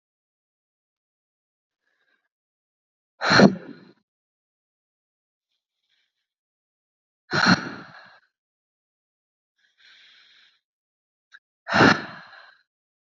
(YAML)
exhalation_length: 13.1 s
exhalation_amplitude: 27166
exhalation_signal_mean_std_ratio: 0.2
survey_phase: beta (2021-08-13 to 2022-03-07)
age: 18-44
gender: Female
wearing_mask: 'No'
symptom_none: true
smoker_status: Ex-smoker
respiratory_condition_asthma: false
respiratory_condition_other: false
recruitment_source: Test and Trace
submission_delay: 1 day
covid_test_result: Negative
covid_test_method: RT-qPCR